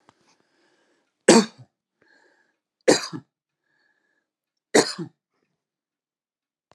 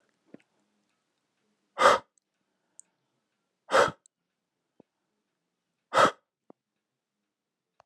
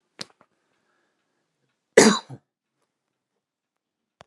{
  "three_cough_length": "6.7 s",
  "three_cough_amplitude": 31093,
  "three_cough_signal_mean_std_ratio": 0.2,
  "exhalation_length": "7.9 s",
  "exhalation_amplitude": 19408,
  "exhalation_signal_mean_std_ratio": 0.2,
  "cough_length": "4.3 s",
  "cough_amplitude": 32767,
  "cough_signal_mean_std_ratio": 0.17,
  "survey_phase": "beta (2021-08-13 to 2022-03-07)",
  "age": "65+",
  "gender": "Male",
  "wearing_mask": "No",
  "symptom_none": true,
  "smoker_status": "Ex-smoker",
  "respiratory_condition_asthma": false,
  "respiratory_condition_other": false,
  "recruitment_source": "REACT",
  "submission_delay": "1 day",
  "covid_test_result": "Negative",
  "covid_test_method": "RT-qPCR"
}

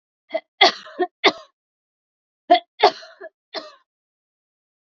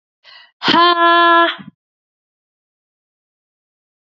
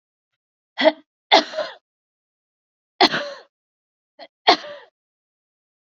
{
  "cough_length": "4.9 s",
  "cough_amplitude": 28055,
  "cough_signal_mean_std_ratio": 0.25,
  "exhalation_length": "4.1 s",
  "exhalation_amplitude": 29240,
  "exhalation_signal_mean_std_ratio": 0.36,
  "three_cough_length": "5.9 s",
  "three_cough_amplitude": 30211,
  "three_cough_signal_mean_std_ratio": 0.25,
  "survey_phase": "beta (2021-08-13 to 2022-03-07)",
  "age": "18-44",
  "gender": "Female",
  "wearing_mask": "Yes",
  "symptom_cough_any": true,
  "smoker_status": "Ex-smoker",
  "respiratory_condition_asthma": false,
  "respiratory_condition_other": false,
  "recruitment_source": "REACT",
  "submission_delay": "1 day",
  "covid_test_result": "Negative",
  "covid_test_method": "RT-qPCR",
  "influenza_a_test_result": "Negative",
  "influenza_b_test_result": "Negative"
}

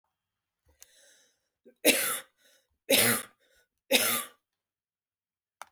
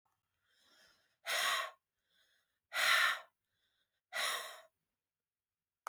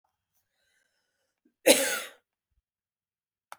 {
  "three_cough_length": "5.7 s",
  "three_cough_amplitude": 15689,
  "three_cough_signal_mean_std_ratio": 0.32,
  "exhalation_length": "5.9 s",
  "exhalation_amplitude": 4370,
  "exhalation_signal_mean_std_ratio": 0.36,
  "cough_length": "3.6 s",
  "cough_amplitude": 19872,
  "cough_signal_mean_std_ratio": 0.21,
  "survey_phase": "beta (2021-08-13 to 2022-03-07)",
  "age": "45-64",
  "gender": "Female",
  "wearing_mask": "No",
  "symptom_headache": true,
  "smoker_status": "Never smoked",
  "respiratory_condition_asthma": false,
  "respiratory_condition_other": false,
  "recruitment_source": "REACT",
  "submission_delay": "1 day",
  "covid_test_result": "Negative",
  "covid_test_method": "RT-qPCR",
  "influenza_a_test_result": "Negative",
  "influenza_b_test_result": "Negative"
}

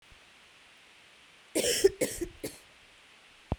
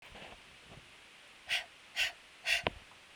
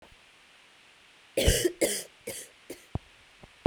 {
  "cough_length": "3.6 s",
  "cough_amplitude": 10903,
  "cough_signal_mean_std_ratio": 0.34,
  "exhalation_length": "3.2 s",
  "exhalation_amplitude": 9118,
  "exhalation_signal_mean_std_ratio": 0.42,
  "three_cough_length": "3.7 s",
  "three_cough_amplitude": 13863,
  "three_cough_signal_mean_std_ratio": 0.35,
  "survey_phase": "beta (2021-08-13 to 2022-03-07)",
  "age": "18-44",
  "gender": "Female",
  "wearing_mask": "No",
  "symptom_cough_any": true,
  "symptom_new_continuous_cough": true,
  "symptom_runny_or_blocked_nose": true,
  "symptom_sore_throat": true,
  "symptom_fatigue": true,
  "symptom_fever_high_temperature": true,
  "symptom_headache": true,
  "symptom_onset": "2 days",
  "smoker_status": "Never smoked",
  "respiratory_condition_asthma": false,
  "respiratory_condition_other": false,
  "recruitment_source": "Test and Trace",
  "submission_delay": "-1 day",
  "covid_test_result": "Positive",
  "covid_test_method": "RT-qPCR",
  "covid_ct_value": 15.5,
  "covid_ct_gene": "N gene"
}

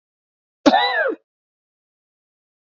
{
  "cough_length": "2.7 s",
  "cough_amplitude": 27469,
  "cough_signal_mean_std_ratio": 0.32,
  "survey_phase": "beta (2021-08-13 to 2022-03-07)",
  "age": "45-64",
  "gender": "Male",
  "wearing_mask": "No",
  "symptom_runny_or_blocked_nose": true,
  "symptom_other": true,
  "smoker_status": "Never smoked",
  "respiratory_condition_asthma": false,
  "respiratory_condition_other": false,
  "recruitment_source": "Test and Trace",
  "submission_delay": "1 day",
  "covid_test_result": "Negative",
  "covid_test_method": "RT-qPCR"
}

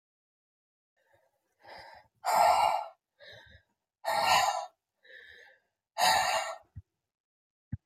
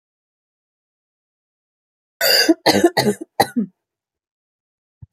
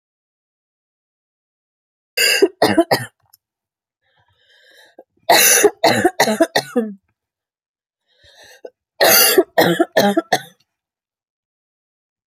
{
  "exhalation_length": "7.9 s",
  "exhalation_amplitude": 7996,
  "exhalation_signal_mean_std_ratio": 0.4,
  "cough_length": "5.1 s",
  "cough_amplitude": 29675,
  "cough_signal_mean_std_ratio": 0.32,
  "three_cough_length": "12.3 s",
  "three_cough_amplitude": 32768,
  "three_cough_signal_mean_std_ratio": 0.37,
  "survey_phase": "beta (2021-08-13 to 2022-03-07)",
  "age": "18-44",
  "gender": "Female",
  "wearing_mask": "No",
  "symptom_cough_any": true,
  "symptom_new_continuous_cough": true,
  "symptom_sore_throat": true,
  "symptom_fatigue": true,
  "symptom_fever_high_temperature": true,
  "symptom_headache": true,
  "smoker_status": "Ex-smoker",
  "respiratory_condition_asthma": false,
  "respiratory_condition_other": false,
  "recruitment_source": "Test and Trace",
  "submission_delay": "1 day",
  "covid_test_result": "Positive",
  "covid_test_method": "LFT"
}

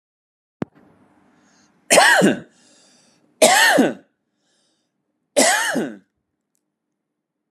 {
  "three_cough_length": "7.5 s",
  "three_cough_amplitude": 32748,
  "three_cough_signal_mean_std_ratio": 0.36,
  "survey_phase": "beta (2021-08-13 to 2022-03-07)",
  "age": "18-44",
  "wearing_mask": "No",
  "symptom_none": true,
  "smoker_status": "Ex-smoker",
  "respiratory_condition_asthma": true,
  "respiratory_condition_other": false,
  "recruitment_source": "Test and Trace",
  "submission_delay": "0 days",
  "covid_test_result": "Negative",
  "covid_test_method": "LFT"
}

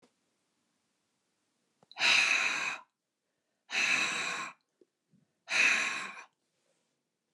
{
  "exhalation_length": "7.3 s",
  "exhalation_amplitude": 8179,
  "exhalation_signal_mean_std_ratio": 0.43,
  "survey_phase": "beta (2021-08-13 to 2022-03-07)",
  "age": "65+",
  "gender": "Female",
  "wearing_mask": "No",
  "symptom_none": true,
  "smoker_status": "Prefer not to say",
  "respiratory_condition_asthma": false,
  "respiratory_condition_other": false,
  "recruitment_source": "REACT",
  "submission_delay": "3 days",
  "covid_test_result": "Negative",
  "covid_test_method": "RT-qPCR",
  "influenza_a_test_result": "Negative",
  "influenza_b_test_result": "Negative"
}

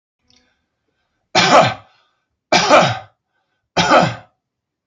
{
  "cough_length": "4.9 s",
  "cough_amplitude": 32260,
  "cough_signal_mean_std_ratio": 0.39,
  "survey_phase": "alpha (2021-03-01 to 2021-08-12)",
  "age": "45-64",
  "gender": "Male",
  "wearing_mask": "No",
  "symptom_none": true,
  "smoker_status": "Ex-smoker",
  "respiratory_condition_asthma": false,
  "respiratory_condition_other": false,
  "recruitment_source": "REACT",
  "submission_delay": "1 day",
  "covid_test_result": "Negative",
  "covid_test_method": "RT-qPCR"
}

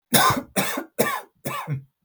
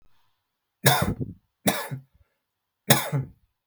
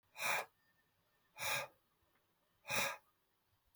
{
  "cough_length": "2.0 s",
  "cough_amplitude": 28048,
  "cough_signal_mean_std_ratio": 0.56,
  "three_cough_length": "3.7 s",
  "three_cough_amplitude": 32448,
  "three_cough_signal_mean_std_ratio": 0.36,
  "exhalation_length": "3.8 s",
  "exhalation_amplitude": 2461,
  "exhalation_signal_mean_std_ratio": 0.39,
  "survey_phase": "beta (2021-08-13 to 2022-03-07)",
  "age": "18-44",
  "gender": "Male",
  "wearing_mask": "No",
  "symptom_none": true,
  "smoker_status": "Never smoked",
  "respiratory_condition_asthma": false,
  "respiratory_condition_other": false,
  "recruitment_source": "REACT",
  "submission_delay": "1 day",
  "covid_test_result": "Negative",
  "covid_test_method": "RT-qPCR",
  "influenza_a_test_result": "Negative",
  "influenza_b_test_result": "Negative"
}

